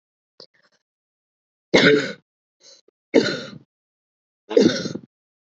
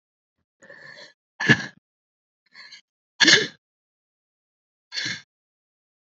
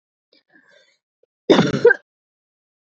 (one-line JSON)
{"three_cough_length": "5.5 s", "three_cough_amplitude": 27388, "three_cough_signal_mean_std_ratio": 0.3, "exhalation_length": "6.1 s", "exhalation_amplitude": 27570, "exhalation_signal_mean_std_ratio": 0.23, "cough_length": "3.0 s", "cough_amplitude": 29632, "cough_signal_mean_std_ratio": 0.27, "survey_phase": "alpha (2021-03-01 to 2021-08-12)", "age": "18-44", "gender": "Female", "wearing_mask": "No", "symptom_cough_any": true, "symptom_abdominal_pain": true, "symptom_headache": true, "smoker_status": "Never smoked", "respiratory_condition_asthma": false, "respiratory_condition_other": false, "recruitment_source": "Test and Trace", "submission_delay": "1 day", "covid_test_result": "Positive", "covid_test_method": "LFT"}